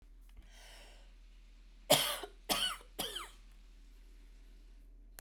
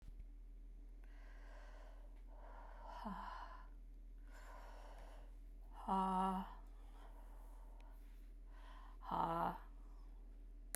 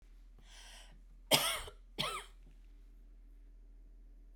{"three_cough_length": "5.2 s", "three_cough_amplitude": 13129, "three_cough_signal_mean_std_ratio": 0.4, "exhalation_length": "10.8 s", "exhalation_amplitude": 2599, "exhalation_signal_mean_std_ratio": 0.76, "cough_length": "4.4 s", "cough_amplitude": 10455, "cough_signal_mean_std_ratio": 0.4, "survey_phase": "beta (2021-08-13 to 2022-03-07)", "age": "45-64", "gender": "Female", "wearing_mask": "No", "symptom_cough_any": true, "symptom_sore_throat": true, "symptom_fatigue": true, "symptom_onset": "12 days", "smoker_status": "Never smoked", "respiratory_condition_asthma": true, "respiratory_condition_other": false, "recruitment_source": "REACT", "submission_delay": "2 days", "covid_test_result": "Negative", "covid_test_method": "RT-qPCR"}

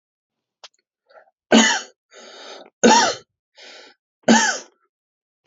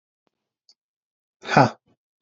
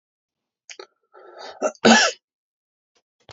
{"three_cough_length": "5.5 s", "three_cough_amplitude": 27875, "three_cough_signal_mean_std_ratio": 0.33, "exhalation_length": "2.2 s", "exhalation_amplitude": 28290, "exhalation_signal_mean_std_ratio": 0.21, "cough_length": "3.3 s", "cough_amplitude": 29804, "cough_signal_mean_std_ratio": 0.26, "survey_phase": "alpha (2021-03-01 to 2021-08-12)", "age": "18-44", "gender": "Male", "wearing_mask": "No", "symptom_none": true, "smoker_status": "Never smoked", "respiratory_condition_asthma": false, "respiratory_condition_other": false, "recruitment_source": "REACT", "submission_delay": "1 day", "covid_test_result": "Negative", "covid_test_method": "RT-qPCR"}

